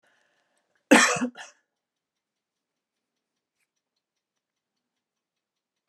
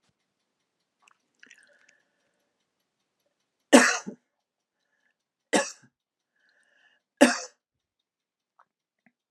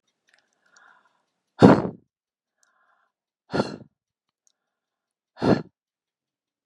{"cough_length": "5.9 s", "cough_amplitude": 27177, "cough_signal_mean_std_ratio": 0.17, "three_cough_length": "9.3 s", "three_cough_amplitude": 28290, "three_cough_signal_mean_std_ratio": 0.17, "exhalation_length": "6.7 s", "exhalation_amplitude": 32768, "exhalation_signal_mean_std_ratio": 0.19, "survey_phase": "alpha (2021-03-01 to 2021-08-12)", "age": "65+", "gender": "Female", "wearing_mask": "No", "symptom_diarrhoea": true, "smoker_status": "Never smoked", "respiratory_condition_asthma": false, "respiratory_condition_other": false, "recruitment_source": "REACT", "submission_delay": "1 day", "covid_test_result": "Negative", "covid_test_method": "RT-qPCR"}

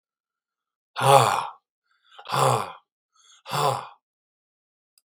{"exhalation_length": "5.1 s", "exhalation_amplitude": 32767, "exhalation_signal_mean_std_ratio": 0.34, "survey_phase": "beta (2021-08-13 to 2022-03-07)", "age": "65+", "gender": "Male", "wearing_mask": "No", "symptom_cough_any": true, "symptom_abdominal_pain": true, "smoker_status": "Ex-smoker", "respiratory_condition_asthma": false, "respiratory_condition_other": false, "recruitment_source": "REACT", "submission_delay": "5 days", "covid_test_result": "Negative", "covid_test_method": "RT-qPCR", "influenza_a_test_result": "Negative", "influenza_b_test_result": "Negative"}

